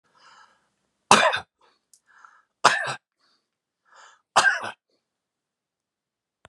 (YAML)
three_cough_length: 6.5 s
three_cough_amplitude: 32572
three_cough_signal_mean_std_ratio: 0.25
survey_phase: beta (2021-08-13 to 2022-03-07)
age: 65+
gender: Male
wearing_mask: 'No'
symptom_none: true
smoker_status: Never smoked
respiratory_condition_asthma: false
respiratory_condition_other: false
recruitment_source: REACT
submission_delay: 2 days
covid_test_result: Negative
covid_test_method: RT-qPCR
influenza_a_test_result: Negative
influenza_b_test_result: Negative